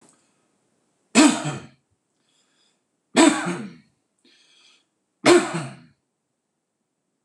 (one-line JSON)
{"three_cough_length": "7.2 s", "three_cough_amplitude": 26027, "three_cough_signal_mean_std_ratio": 0.28, "survey_phase": "beta (2021-08-13 to 2022-03-07)", "age": "45-64", "gender": "Male", "wearing_mask": "No", "symptom_none": true, "smoker_status": "Ex-smoker", "respiratory_condition_asthma": false, "respiratory_condition_other": false, "recruitment_source": "REACT", "submission_delay": "2 days", "covid_test_result": "Negative", "covid_test_method": "RT-qPCR", "influenza_a_test_result": "Negative", "influenza_b_test_result": "Negative"}